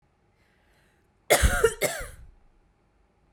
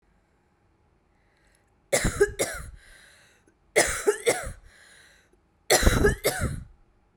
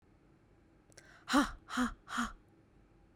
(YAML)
cough_length: 3.3 s
cough_amplitude: 19649
cough_signal_mean_std_ratio: 0.32
three_cough_length: 7.2 s
three_cough_amplitude: 25660
three_cough_signal_mean_std_ratio: 0.39
exhalation_length: 3.2 s
exhalation_amplitude: 4938
exhalation_signal_mean_std_ratio: 0.37
survey_phase: beta (2021-08-13 to 2022-03-07)
age: 18-44
gender: Female
wearing_mask: 'No'
symptom_cough_any: true
symptom_diarrhoea: true
symptom_fatigue: true
symptom_fever_high_temperature: true
symptom_headache: true
symptom_change_to_sense_of_smell_or_taste: true
symptom_loss_of_taste: true
symptom_onset: 4 days
smoker_status: Never smoked
respiratory_condition_asthma: false
respiratory_condition_other: false
recruitment_source: Test and Trace
submission_delay: 2 days
covid_test_result: Positive
covid_test_method: RT-qPCR
covid_ct_value: 18.3
covid_ct_gene: N gene
covid_ct_mean: 18.9
covid_viral_load: 650000 copies/ml
covid_viral_load_category: Low viral load (10K-1M copies/ml)